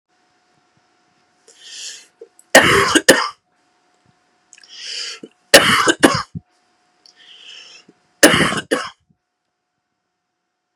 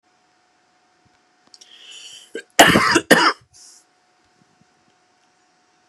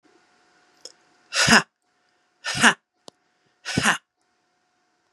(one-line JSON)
{"three_cough_length": "10.8 s", "three_cough_amplitude": 32768, "three_cough_signal_mean_std_ratio": 0.31, "cough_length": "5.9 s", "cough_amplitude": 32768, "cough_signal_mean_std_ratio": 0.26, "exhalation_length": "5.1 s", "exhalation_amplitude": 32717, "exhalation_signal_mean_std_ratio": 0.27, "survey_phase": "beta (2021-08-13 to 2022-03-07)", "age": "18-44", "gender": "Female", "wearing_mask": "No", "symptom_cough_any": true, "symptom_runny_or_blocked_nose": true, "symptom_sore_throat": true, "symptom_fatigue": true, "symptom_change_to_sense_of_smell_or_taste": true, "symptom_onset": "12 days", "smoker_status": "Never smoked", "respiratory_condition_asthma": false, "respiratory_condition_other": false, "recruitment_source": "REACT", "submission_delay": "3 days", "covid_test_result": "Negative", "covid_test_method": "RT-qPCR"}